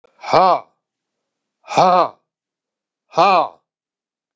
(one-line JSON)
{"exhalation_length": "4.4 s", "exhalation_amplitude": 32768, "exhalation_signal_mean_std_ratio": 0.35, "survey_phase": "beta (2021-08-13 to 2022-03-07)", "age": "65+", "gender": "Male", "wearing_mask": "No", "symptom_cough_any": true, "smoker_status": "Never smoked", "respiratory_condition_asthma": false, "respiratory_condition_other": false, "recruitment_source": "Test and Trace", "submission_delay": "2 days", "covid_test_result": "Positive", "covid_test_method": "RT-qPCR", "covid_ct_value": 16.8, "covid_ct_gene": "ORF1ab gene", "covid_ct_mean": 17.2, "covid_viral_load": "2400000 copies/ml", "covid_viral_load_category": "High viral load (>1M copies/ml)"}